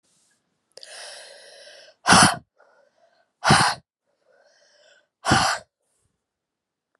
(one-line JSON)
{"exhalation_length": "7.0 s", "exhalation_amplitude": 28588, "exhalation_signal_mean_std_ratio": 0.29, "survey_phase": "beta (2021-08-13 to 2022-03-07)", "age": "45-64", "gender": "Female", "wearing_mask": "No", "symptom_new_continuous_cough": true, "symptom_runny_or_blocked_nose": true, "symptom_shortness_of_breath": true, "symptom_sore_throat": true, "symptom_diarrhoea": true, "symptom_fatigue": true, "symptom_onset": "4 days", "smoker_status": "Never smoked", "respiratory_condition_asthma": false, "respiratory_condition_other": false, "recruitment_source": "Test and Trace", "submission_delay": "0 days", "covid_test_result": "Positive", "covid_test_method": "LAMP"}